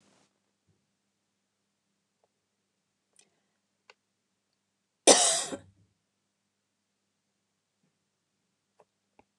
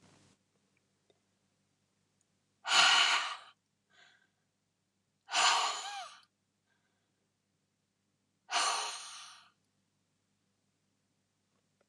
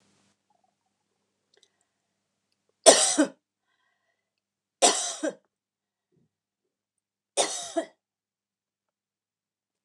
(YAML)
cough_length: 9.4 s
cough_amplitude: 25270
cough_signal_mean_std_ratio: 0.14
exhalation_length: 11.9 s
exhalation_amplitude: 8030
exhalation_signal_mean_std_ratio: 0.3
three_cough_length: 9.8 s
three_cough_amplitude: 29204
three_cough_signal_mean_std_ratio: 0.21
survey_phase: beta (2021-08-13 to 2022-03-07)
age: 65+
gender: Female
wearing_mask: 'No'
symptom_none: true
smoker_status: Never smoked
respiratory_condition_asthma: false
respiratory_condition_other: false
recruitment_source: REACT
submission_delay: 1 day
covid_test_result: Negative
covid_test_method: RT-qPCR
influenza_a_test_result: Negative
influenza_b_test_result: Negative